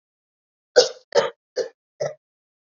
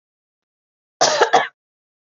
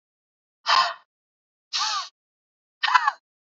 {
  "three_cough_length": "2.6 s",
  "three_cough_amplitude": 27406,
  "three_cough_signal_mean_std_ratio": 0.28,
  "cough_length": "2.1 s",
  "cough_amplitude": 29433,
  "cough_signal_mean_std_ratio": 0.33,
  "exhalation_length": "3.5 s",
  "exhalation_amplitude": 26068,
  "exhalation_signal_mean_std_ratio": 0.35,
  "survey_phase": "beta (2021-08-13 to 2022-03-07)",
  "age": "18-44",
  "gender": "Female",
  "wearing_mask": "No",
  "symptom_none": true,
  "smoker_status": "Never smoked",
  "respiratory_condition_asthma": false,
  "respiratory_condition_other": false,
  "recruitment_source": "REACT",
  "submission_delay": "2 days",
  "covid_test_result": "Negative",
  "covid_test_method": "RT-qPCR",
  "influenza_a_test_result": "Negative",
  "influenza_b_test_result": "Negative"
}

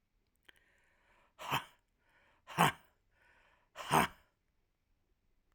{
  "exhalation_length": "5.5 s",
  "exhalation_amplitude": 7364,
  "exhalation_signal_mean_std_ratio": 0.24,
  "survey_phase": "alpha (2021-03-01 to 2021-08-12)",
  "age": "45-64",
  "gender": "Male",
  "wearing_mask": "No",
  "symptom_none": true,
  "smoker_status": "Never smoked",
  "respiratory_condition_asthma": false,
  "respiratory_condition_other": false,
  "recruitment_source": "REACT",
  "submission_delay": "2 days",
  "covid_test_result": "Negative",
  "covid_test_method": "RT-qPCR"
}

